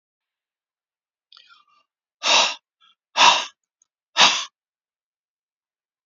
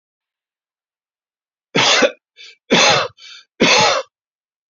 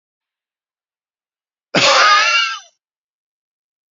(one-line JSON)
{"exhalation_length": "6.1 s", "exhalation_amplitude": 31135, "exhalation_signal_mean_std_ratio": 0.27, "three_cough_length": "4.7 s", "three_cough_amplitude": 30623, "three_cough_signal_mean_std_ratio": 0.41, "cough_length": "3.9 s", "cough_amplitude": 30562, "cough_signal_mean_std_ratio": 0.37, "survey_phase": "beta (2021-08-13 to 2022-03-07)", "age": "65+", "gender": "Male", "wearing_mask": "No", "symptom_none": true, "smoker_status": "Never smoked", "respiratory_condition_asthma": false, "respiratory_condition_other": false, "recruitment_source": "REACT", "submission_delay": "2 days", "covid_test_result": "Negative", "covid_test_method": "RT-qPCR", "influenza_a_test_result": "Negative", "influenza_b_test_result": "Negative"}